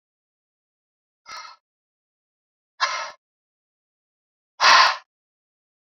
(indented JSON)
{
  "exhalation_length": "6.0 s",
  "exhalation_amplitude": 26224,
  "exhalation_signal_mean_std_ratio": 0.23,
  "survey_phase": "alpha (2021-03-01 to 2021-08-12)",
  "age": "45-64",
  "gender": "Male",
  "wearing_mask": "No",
  "symptom_none": true,
  "symptom_onset": "6 days",
  "smoker_status": "Never smoked",
  "respiratory_condition_asthma": false,
  "respiratory_condition_other": false,
  "recruitment_source": "REACT",
  "submission_delay": "2 days",
  "covid_test_result": "Negative",
  "covid_test_method": "RT-qPCR"
}